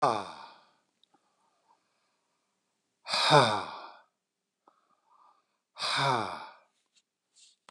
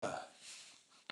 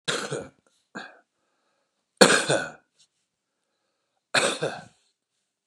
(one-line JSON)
{"exhalation_length": "7.7 s", "exhalation_amplitude": 14825, "exhalation_signal_mean_std_ratio": 0.31, "cough_length": "1.1 s", "cough_amplitude": 5609, "cough_signal_mean_std_ratio": 0.45, "three_cough_length": "5.7 s", "three_cough_amplitude": 32767, "three_cough_signal_mean_std_ratio": 0.29, "survey_phase": "beta (2021-08-13 to 2022-03-07)", "age": "65+", "gender": "Male", "wearing_mask": "No", "symptom_runny_or_blocked_nose": true, "symptom_fatigue": true, "symptom_onset": "3 days", "smoker_status": "Current smoker (1 to 10 cigarettes per day)", "respiratory_condition_asthma": false, "respiratory_condition_other": false, "recruitment_source": "Test and Trace", "submission_delay": "2 days", "covid_test_result": "Positive", "covid_test_method": "ePCR"}